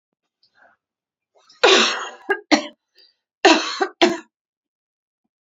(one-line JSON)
{"cough_length": "5.5 s", "cough_amplitude": 29732, "cough_signal_mean_std_ratio": 0.33, "survey_phase": "beta (2021-08-13 to 2022-03-07)", "age": "45-64", "gender": "Female", "wearing_mask": "No", "symptom_runny_or_blocked_nose": true, "smoker_status": "Never smoked", "respiratory_condition_asthma": false, "respiratory_condition_other": false, "recruitment_source": "REACT", "submission_delay": "6 days", "covid_test_result": "Negative", "covid_test_method": "RT-qPCR", "influenza_a_test_result": "Negative", "influenza_b_test_result": "Negative"}